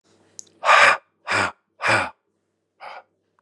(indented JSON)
{
  "exhalation_length": "3.4 s",
  "exhalation_amplitude": 28753,
  "exhalation_signal_mean_std_ratio": 0.38,
  "survey_phase": "beta (2021-08-13 to 2022-03-07)",
  "age": "45-64",
  "gender": "Male",
  "wearing_mask": "No",
  "symptom_none": true,
  "smoker_status": "Ex-smoker",
  "respiratory_condition_asthma": false,
  "respiratory_condition_other": false,
  "recruitment_source": "REACT",
  "submission_delay": "0 days",
  "covid_test_result": "Negative",
  "covid_test_method": "RT-qPCR",
  "influenza_a_test_result": "Negative",
  "influenza_b_test_result": "Negative"
}